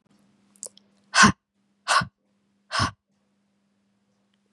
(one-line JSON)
{"exhalation_length": "4.5 s", "exhalation_amplitude": 24835, "exhalation_signal_mean_std_ratio": 0.24, "survey_phase": "beta (2021-08-13 to 2022-03-07)", "age": "18-44", "gender": "Female", "wearing_mask": "No", "symptom_runny_or_blocked_nose": true, "symptom_sore_throat": true, "symptom_other": true, "symptom_onset": "8 days", "smoker_status": "Never smoked", "respiratory_condition_asthma": false, "respiratory_condition_other": false, "recruitment_source": "Test and Trace", "submission_delay": "2 days", "covid_test_result": "Positive", "covid_test_method": "RT-qPCR", "covid_ct_value": 17.3, "covid_ct_gene": "ORF1ab gene", "covid_ct_mean": 17.5, "covid_viral_load": "1800000 copies/ml", "covid_viral_load_category": "High viral load (>1M copies/ml)"}